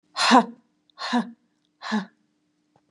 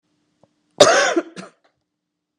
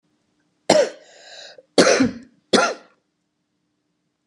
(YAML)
exhalation_length: 2.9 s
exhalation_amplitude: 23291
exhalation_signal_mean_std_ratio: 0.34
cough_length: 2.4 s
cough_amplitude: 32768
cough_signal_mean_std_ratio: 0.31
three_cough_length: 4.3 s
three_cough_amplitude: 32701
three_cough_signal_mean_std_ratio: 0.33
survey_phase: beta (2021-08-13 to 2022-03-07)
age: 65+
gender: Female
wearing_mask: 'No'
symptom_cough_any: true
smoker_status: Never smoked
respiratory_condition_asthma: false
respiratory_condition_other: false
recruitment_source: REACT
submission_delay: 1 day
covid_test_result: Negative
covid_test_method: RT-qPCR
influenza_a_test_result: Negative
influenza_b_test_result: Negative